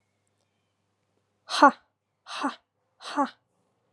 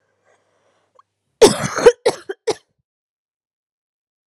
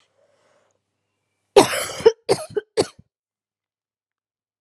exhalation_length: 3.9 s
exhalation_amplitude: 24366
exhalation_signal_mean_std_ratio: 0.22
three_cough_length: 4.3 s
three_cough_amplitude: 32768
three_cough_signal_mean_std_ratio: 0.23
cough_length: 4.6 s
cough_amplitude: 32767
cough_signal_mean_std_ratio: 0.23
survey_phase: alpha (2021-03-01 to 2021-08-12)
age: 18-44
gender: Female
wearing_mask: 'No'
symptom_shortness_of_breath: true
symptom_fatigue: true
symptom_fever_high_temperature: true
smoker_status: Never smoked
respiratory_condition_asthma: false
respiratory_condition_other: false
recruitment_source: Test and Trace
submission_delay: 2 days
covid_test_result: Positive
covid_test_method: LFT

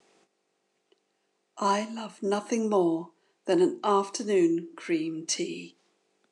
exhalation_length: 6.3 s
exhalation_amplitude: 7766
exhalation_signal_mean_std_ratio: 0.58
survey_phase: beta (2021-08-13 to 2022-03-07)
age: 45-64
gender: Female
wearing_mask: 'No'
symptom_cough_any: true
symptom_runny_or_blocked_nose: true
symptom_shortness_of_breath: true
symptom_sore_throat: true
symptom_fatigue: true
symptom_onset: 2 days
smoker_status: Ex-smoker
respiratory_condition_asthma: false
respiratory_condition_other: false
recruitment_source: Test and Trace
submission_delay: 2 days
covid_test_result: Positive
covid_test_method: RT-qPCR
covid_ct_value: 17.6
covid_ct_gene: ORF1ab gene
covid_ct_mean: 17.8
covid_viral_load: 1500000 copies/ml
covid_viral_load_category: High viral load (>1M copies/ml)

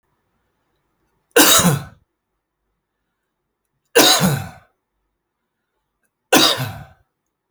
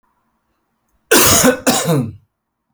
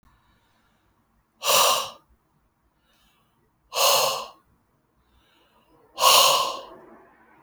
three_cough_length: 7.5 s
three_cough_amplitude: 32768
three_cough_signal_mean_std_ratio: 0.32
cough_length: 2.7 s
cough_amplitude: 32768
cough_signal_mean_std_ratio: 0.47
exhalation_length: 7.4 s
exhalation_amplitude: 22441
exhalation_signal_mean_std_ratio: 0.36
survey_phase: beta (2021-08-13 to 2022-03-07)
age: 45-64
gender: Male
wearing_mask: 'No'
symptom_none: true
smoker_status: Current smoker (e-cigarettes or vapes only)
respiratory_condition_asthma: false
respiratory_condition_other: false
recruitment_source: REACT
submission_delay: 0 days
covid_test_result: Negative
covid_test_method: RT-qPCR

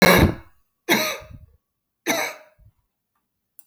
three_cough_length: 3.7 s
three_cough_amplitude: 30457
three_cough_signal_mean_std_ratio: 0.35
survey_phase: beta (2021-08-13 to 2022-03-07)
age: 45-64
gender: Female
wearing_mask: 'No'
symptom_cough_any: true
symptom_new_continuous_cough: true
symptom_runny_or_blocked_nose: true
symptom_abdominal_pain: true
symptom_fatigue: true
symptom_fever_high_temperature: true
symptom_headache: true
symptom_onset: 3 days
smoker_status: Never smoked
respiratory_condition_asthma: false
respiratory_condition_other: false
recruitment_source: Test and Trace
submission_delay: 1 day
covid_test_result: Positive
covid_test_method: RT-qPCR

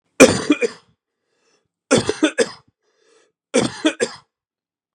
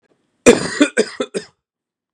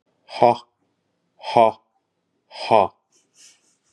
three_cough_length: 4.9 s
three_cough_amplitude: 32768
three_cough_signal_mean_std_ratio: 0.32
cough_length: 2.1 s
cough_amplitude: 32768
cough_signal_mean_std_ratio: 0.33
exhalation_length: 3.9 s
exhalation_amplitude: 30665
exhalation_signal_mean_std_ratio: 0.27
survey_phase: beta (2021-08-13 to 2022-03-07)
age: 45-64
gender: Male
wearing_mask: 'No'
symptom_sore_throat: true
symptom_diarrhoea: true
symptom_fatigue: true
symptom_headache: true
smoker_status: Ex-smoker
respiratory_condition_asthma: false
respiratory_condition_other: false
recruitment_source: Test and Trace
submission_delay: 1 day
covid_test_result: Positive
covid_test_method: LFT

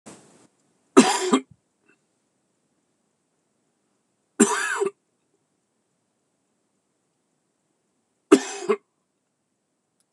three_cough_length: 10.1 s
three_cough_amplitude: 26028
three_cough_signal_mean_std_ratio: 0.22
survey_phase: beta (2021-08-13 to 2022-03-07)
age: 45-64
gender: Male
wearing_mask: 'No'
symptom_cough_any: true
symptom_runny_or_blocked_nose: true
symptom_fever_high_temperature: true
symptom_onset: 4 days
smoker_status: Never smoked
respiratory_condition_asthma: false
respiratory_condition_other: false
recruitment_source: Test and Trace
submission_delay: 2 days
covid_test_result: Positive
covid_test_method: RT-qPCR
covid_ct_value: 15.8
covid_ct_gene: ORF1ab gene
covid_ct_mean: 16.2
covid_viral_load: 4800000 copies/ml
covid_viral_load_category: High viral load (>1M copies/ml)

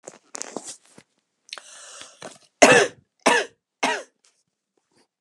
three_cough_length: 5.2 s
three_cough_amplitude: 32767
three_cough_signal_mean_std_ratio: 0.27
survey_phase: beta (2021-08-13 to 2022-03-07)
age: 18-44
gender: Female
wearing_mask: 'No'
symptom_cough_any: true
symptom_runny_or_blocked_nose: true
symptom_sore_throat: true
symptom_fatigue: true
symptom_headache: true
symptom_onset: 5 days
smoker_status: Never smoked
respiratory_condition_asthma: true
respiratory_condition_other: false
recruitment_source: Test and Trace
submission_delay: 1 day
covid_test_result: Positive
covid_test_method: RT-qPCR
covid_ct_value: 20.1
covid_ct_gene: N gene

